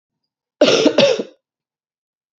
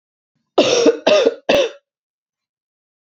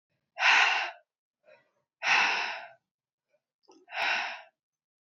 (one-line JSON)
{"cough_length": "2.4 s", "cough_amplitude": 30839, "cough_signal_mean_std_ratio": 0.39, "three_cough_length": "3.1 s", "three_cough_amplitude": 28795, "three_cough_signal_mean_std_ratio": 0.44, "exhalation_length": "5.0 s", "exhalation_amplitude": 11411, "exhalation_signal_mean_std_ratio": 0.42, "survey_phase": "beta (2021-08-13 to 2022-03-07)", "age": "18-44", "gender": "Female", "wearing_mask": "No", "symptom_cough_any": true, "symptom_new_continuous_cough": true, "symptom_runny_or_blocked_nose": true, "symptom_shortness_of_breath": true, "symptom_sore_throat": true, "symptom_abdominal_pain": true, "symptom_diarrhoea": true, "symptom_fatigue": true, "symptom_fever_high_temperature": true, "symptom_headache": true, "symptom_onset": "3 days", "smoker_status": "Never smoked", "respiratory_condition_asthma": false, "respiratory_condition_other": false, "recruitment_source": "Test and Trace", "submission_delay": "2 days", "covid_test_result": "Positive", "covid_test_method": "RT-qPCR", "covid_ct_value": 16.2, "covid_ct_gene": "ORF1ab gene", "covid_ct_mean": 16.4, "covid_viral_load": "4300000 copies/ml", "covid_viral_load_category": "High viral load (>1M copies/ml)"}